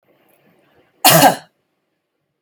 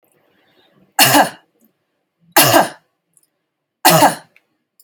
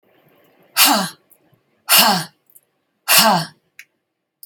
cough_length: 2.4 s
cough_amplitude: 32768
cough_signal_mean_std_ratio: 0.29
three_cough_length: 4.8 s
three_cough_amplitude: 32768
three_cough_signal_mean_std_ratio: 0.35
exhalation_length: 4.5 s
exhalation_amplitude: 32768
exhalation_signal_mean_std_ratio: 0.38
survey_phase: beta (2021-08-13 to 2022-03-07)
age: 45-64
gender: Female
wearing_mask: 'No'
symptom_none: true
smoker_status: Never smoked
respiratory_condition_asthma: false
respiratory_condition_other: false
recruitment_source: REACT
submission_delay: 5 days
covid_test_result: Negative
covid_test_method: RT-qPCR
influenza_a_test_result: Negative
influenza_b_test_result: Negative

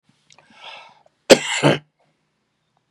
cough_length: 2.9 s
cough_amplitude: 32768
cough_signal_mean_std_ratio: 0.24
survey_phase: beta (2021-08-13 to 2022-03-07)
age: 45-64
gender: Male
wearing_mask: 'No'
symptom_none: true
symptom_onset: 12 days
smoker_status: Never smoked
respiratory_condition_asthma: true
respiratory_condition_other: true
recruitment_source: REACT
submission_delay: 1 day
covid_test_result: Negative
covid_test_method: RT-qPCR
influenza_a_test_result: Negative
influenza_b_test_result: Negative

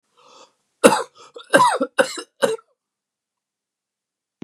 cough_length: 4.4 s
cough_amplitude: 32768
cough_signal_mean_std_ratio: 0.3
survey_phase: beta (2021-08-13 to 2022-03-07)
age: 65+
gender: Male
wearing_mask: 'No'
symptom_none: true
smoker_status: Never smoked
respiratory_condition_asthma: false
respiratory_condition_other: false
recruitment_source: REACT
submission_delay: 0 days
covid_test_result: Negative
covid_test_method: RT-qPCR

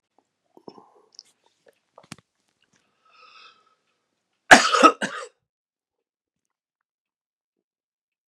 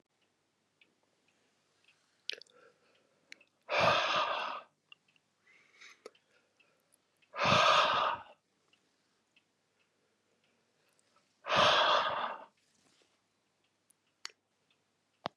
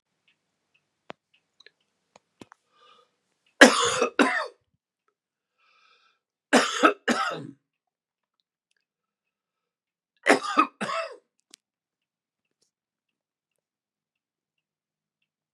cough_length: 8.3 s
cough_amplitude: 32768
cough_signal_mean_std_ratio: 0.16
exhalation_length: 15.4 s
exhalation_amplitude: 6956
exhalation_signal_mean_std_ratio: 0.33
three_cough_length: 15.5 s
three_cough_amplitude: 32762
three_cough_signal_mean_std_ratio: 0.23
survey_phase: beta (2021-08-13 to 2022-03-07)
age: 65+
gender: Male
wearing_mask: 'No'
symptom_runny_or_blocked_nose: true
symptom_onset: 12 days
smoker_status: Ex-smoker
respiratory_condition_asthma: false
respiratory_condition_other: false
recruitment_source: REACT
submission_delay: 2 days
covid_test_result: Negative
covid_test_method: RT-qPCR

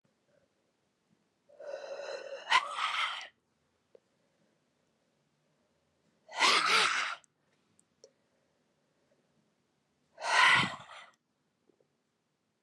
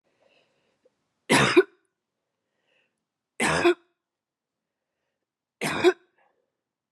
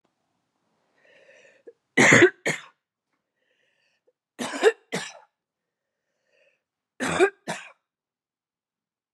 exhalation_length: 12.6 s
exhalation_amplitude: 9583
exhalation_signal_mean_std_ratio: 0.32
cough_length: 6.9 s
cough_amplitude: 16755
cough_signal_mean_std_ratio: 0.27
three_cough_length: 9.1 s
three_cough_amplitude: 28185
three_cough_signal_mean_std_ratio: 0.25
survey_phase: beta (2021-08-13 to 2022-03-07)
age: 45-64
gender: Female
wearing_mask: 'No'
symptom_cough_any: true
symptom_runny_or_blocked_nose: true
symptom_sore_throat: true
symptom_fatigue: true
symptom_fever_high_temperature: true
symptom_headache: true
smoker_status: Never smoked
respiratory_condition_asthma: false
respiratory_condition_other: false
recruitment_source: Test and Trace
submission_delay: 2 days
covid_test_result: Positive
covid_test_method: RT-qPCR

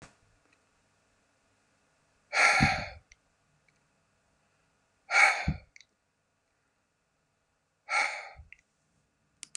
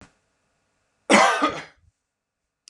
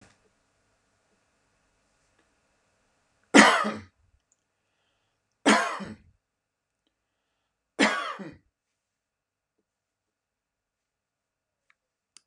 exhalation_length: 9.6 s
exhalation_amplitude: 11941
exhalation_signal_mean_std_ratio: 0.27
cough_length: 2.7 s
cough_amplitude: 27167
cough_signal_mean_std_ratio: 0.32
three_cough_length: 12.3 s
three_cough_amplitude: 32767
three_cough_signal_mean_std_ratio: 0.2
survey_phase: beta (2021-08-13 to 2022-03-07)
age: 65+
gender: Male
wearing_mask: 'No'
symptom_none: true
smoker_status: Ex-smoker
respiratory_condition_asthma: false
respiratory_condition_other: false
recruitment_source: REACT
submission_delay: 3 days
covid_test_result: Negative
covid_test_method: RT-qPCR
influenza_a_test_result: Negative
influenza_b_test_result: Negative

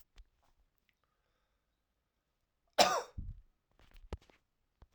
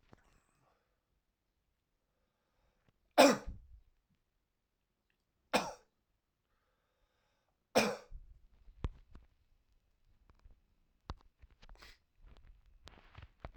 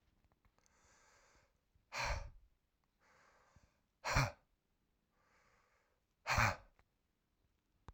cough_length: 4.9 s
cough_amplitude: 9402
cough_signal_mean_std_ratio: 0.2
three_cough_length: 13.6 s
three_cough_amplitude: 10539
three_cough_signal_mean_std_ratio: 0.18
exhalation_length: 7.9 s
exhalation_amplitude: 3642
exhalation_signal_mean_std_ratio: 0.26
survey_phase: alpha (2021-03-01 to 2021-08-12)
age: 45-64
gender: Male
wearing_mask: 'No'
symptom_fatigue: true
symptom_headache: true
symptom_change_to_sense_of_smell_or_taste: true
symptom_loss_of_taste: true
symptom_onset: 3 days
smoker_status: Ex-smoker
respiratory_condition_asthma: false
respiratory_condition_other: false
recruitment_source: Test and Trace
submission_delay: 2 days
covid_test_result: Positive
covid_test_method: RT-qPCR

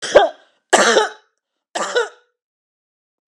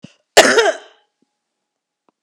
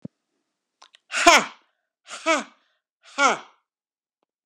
three_cough_length: 3.3 s
three_cough_amplitude: 32768
three_cough_signal_mean_std_ratio: 0.37
cough_length: 2.2 s
cough_amplitude: 32768
cough_signal_mean_std_ratio: 0.31
exhalation_length: 4.5 s
exhalation_amplitude: 32767
exhalation_signal_mean_std_ratio: 0.26
survey_phase: beta (2021-08-13 to 2022-03-07)
age: 45-64
gender: Female
wearing_mask: 'No'
symptom_none: true
smoker_status: Never smoked
respiratory_condition_asthma: false
respiratory_condition_other: false
recruitment_source: REACT
submission_delay: 0 days
covid_test_result: Negative
covid_test_method: RT-qPCR
influenza_a_test_result: Negative
influenza_b_test_result: Negative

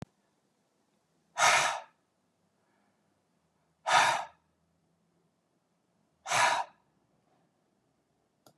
exhalation_length: 8.6 s
exhalation_amplitude: 11676
exhalation_signal_mean_std_ratio: 0.29
survey_phase: beta (2021-08-13 to 2022-03-07)
age: 45-64
gender: Male
wearing_mask: 'No'
symptom_none: true
smoker_status: Never smoked
respiratory_condition_asthma: false
respiratory_condition_other: false
recruitment_source: REACT
submission_delay: 1 day
covid_test_result: Negative
covid_test_method: RT-qPCR
influenza_a_test_result: Negative
influenza_b_test_result: Negative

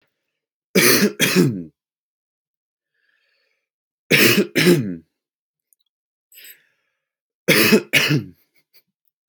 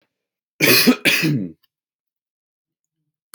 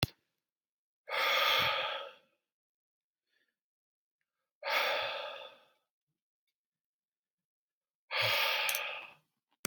three_cough_length: 9.3 s
three_cough_amplitude: 30476
three_cough_signal_mean_std_ratio: 0.38
cough_length: 3.3 s
cough_amplitude: 32768
cough_signal_mean_std_ratio: 0.38
exhalation_length: 9.7 s
exhalation_amplitude: 9922
exhalation_signal_mean_std_ratio: 0.42
survey_phase: alpha (2021-03-01 to 2021-08-12)
age: 18-44
gender: Male
wearing_mask: 'No'
symptom_none: true
smoker_status: Ex-smoker
respiratory_condition_asthma: false
respiratory_condition_other: false
recruitment_source: REACT
submission_delay: 2 days
covid_test_result: Negative
covid_test_method: RT-qPCR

